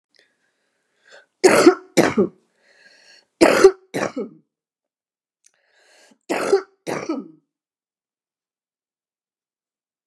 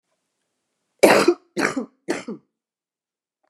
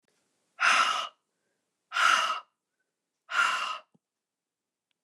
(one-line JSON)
{"three_cough_length": "10.1 s", "three_cough_amplitude": 29204, "three_cough_signal_mean_std_ratio": 0.28, "cough_length": "3.5 s", "cough_amplitude": 29204, "cough_signal_mean_std_ratio": 0.3, "exhalation_length": "5.0 s", "exhalation_amplitude": 11064, "exhalation_signal_mean_std_ratio": 0.41, "survey_phase": "beta (2021-08-13 to 2022-03-07)", "age": "45-64", "gender": "Female", "wearing_mask": "No", "symptom_cough_any": true, "symptom_runny_or_blocked_nose": true, "symptom_change_to_sense_of_smell_or_taste": true, "smoker_status": "Never smoked", "respiratory_condition_asthma": false, "respiratory_condition_other": false, "recruitment_source": "Test and Trace", "submission_delay": "2 days", "covid_test_result": "Positive", "covid_test_method": "LFT"}